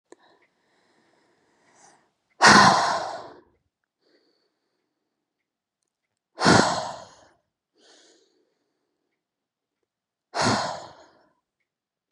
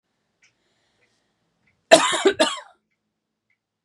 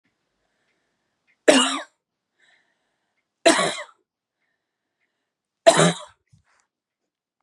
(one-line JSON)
{"exhalation_length": "12.1 s", "exhalation_amplitude": 29729, "exhalation_signal_mean_std_ratio": 0.26, "cough_length": "3.8 s", "cough_amplitude": 32768, "cough_signal_mean_std_ratio": 0.25, "three_cough_length": "7.4 s", "three_cough_amplitude": 32724, "three_cough_signal_mean_std_ratio": 0.25, "survey_phase": "beta (2021-08-13 to 2022-03-07)", "age": "18-44", "gender": "Female", "wearing_mask": "No", "symptom_none": true, "smoker_status": "Never smoked", "respiratory_condition_asthma": false, "respiratory_condition_other": false, "recruitment_source": "REACT", "submission_delay": "4 days", "covid_test_result": "Negative", "covid_test_method": "RT-qPCR", "influenza_a_test_result": "Negative", "influenza_b_test_result": "Negative"}